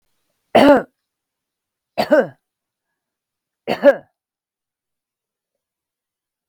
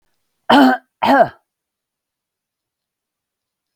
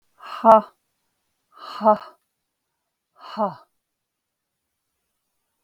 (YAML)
three_cough_length: 6.5 s
three_cough_amplitude: 32768
three_cough_signal_mean_std_ratio: 0.25
cough_length: 3.8 s
cough_amplitude: 32768
cough_signal_mean_std_ratio: 0.31
exhalation_length: 5.6 s
exhalation_amplitude: 32768
exhalation_signal_mean_std_ratio: 0.22
survey_phase: beta (2021-08-13 to 2022-03-07)
age: 45-64
gender: Female
wearing_mask: 'No'
symptom_none: true
smoker_status: Never smoked
respiratory_condition_asthma: true
respiratory_condition_other: false
recruitment_source: REACT
submission_delay: 4 days
covid_test_result: Negative
covid_test_method: RT-qPCR
influenza_a_test_result: Unknown/Void
influenza_b_test_result: Unknown/Void